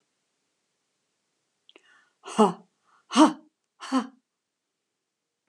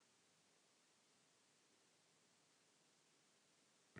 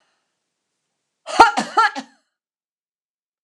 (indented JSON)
{
  "exhalation_length": "5.5 s",
  "exhalation_amplitude": 20942,
  "exhalation_signal_mean_std_ratio": 0.22,
  "three_cough_length": "4.0 s",
  "three_cough_amplitude": 240,
  "three_cough_signal_mean_std_ratio": 0.69,
  "cough_length": "3.4 s",
  "cough_amplitude": 32768,
  "cough_signal_mean_std_ratio": 0.25,
  "survey_phase": "alpha (2021-03-01 to 2021-08-12)",
  "age": "65+",
  "gender": "Female",
  "wearing_mask": "No",
  "symptom_none": true,
  "smoker_status": "Never smoked",
  "respiratory_condition_asthma": false,
  "respiratory_condition_other": false,
  "recruitment_source": "REACT",
  "submission_delay": "2 days",
  "covid_test_result": "Negative",
  "covid_test_method": "RT-qPCR"
}